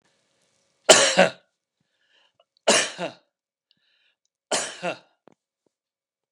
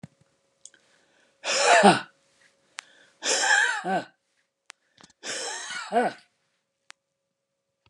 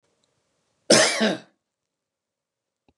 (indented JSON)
{
  "three_cough_length": "6.3 s",
  "three_cough_amplitude": 32768,
  "three_cough_signal_mean_std_ratio": 0.26,
  "exhalation_length": "7.9 s",
  "exhalation_amplitude": 23598,
  "exhalation_signal_mean_std_ratio": 0.36,
  "cough_length": "3.0 s",
  "cough_amplitude": 26791,
  "cough_signal_mean_std_ratio": 0.29,
  "survey_phase": "beta (2021-08-13 to 2022-03-07)",
  "age": "65+",
  "gender": "Male",
  "wearing_mask": "No",
  "symptom_none": true,
  "smoker_status": "Never smoked",
  "respiratory_condition_asthma": false,
  "respiratory_condition_other": false,
  "recruitment_source": "REACT",
  "submission_delay": "11 days",
  "covid_test_result": "Negative",
  "covid_test_method": "RT-qPCR",
  "influenza_a_test_result": "Negative",
  "influenza_b_test_result": "Negative"
}